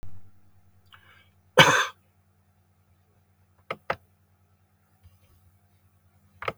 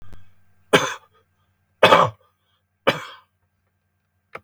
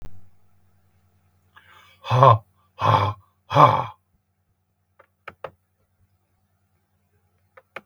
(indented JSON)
{
  "cough_length": "6.6 s",
  "cough_amplitude": 29790,
  "cough_signal_mean_std_ratio": 0.21,
  "three_cough_length": "4.4 s",
  "three_cough_amplitude": 32768,
  "three_cough_signal_mean_std_ratio": 0.27,
  "exhalation_length": "7.9 s",
  "exhalation_amplitude": 32731,
  "exhalation_signal_mean_std_ratio": 0.27,
  "survey_phase": "beta (2021-08-13 to 2022-03-07)",
  "age": "65+",
  "gender": "Male",
  "wearing_mask": "No",
  "symptom_abdominal_pain": true,
  "smoker_status": "Ex-smoker",
  "respiratory_condition_asthma": false,
  "respiratory_condition_other": true,
  "recruitment_source": "REACT",
  "submission_delay": "6 days",
  "covid_test_result": "Negative",
  "covid_test_method": "RT-qPCR",
  "influenza_a_test_result": "Unknown/Void",
  "influenza_b_test_result": "Unknown/Void"
}